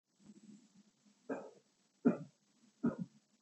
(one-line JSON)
{"three_cough_length": "3.4 s", "three_cough_amplitude": 4292, "three_cough_signal_mean_std_ratio": 0.27, "survey_phase": "beta (2021-08-13 to 2022-03-07)", "age": "45-64", "gender": "Male", "wearing_mask": "No", "symptom_none": true, "smoker_status": "Never smoked", "respiratory_condition_asthma": false, "respiratory_condition_other": false, "recruitment_source": "REACT", "submission_delay": "2 days", "covid_test_result": "Negative", "covid_test_method": "RT-qPCR", "influenza_a_test_result": "Negative", "influenza_b_test_result": "Negative"}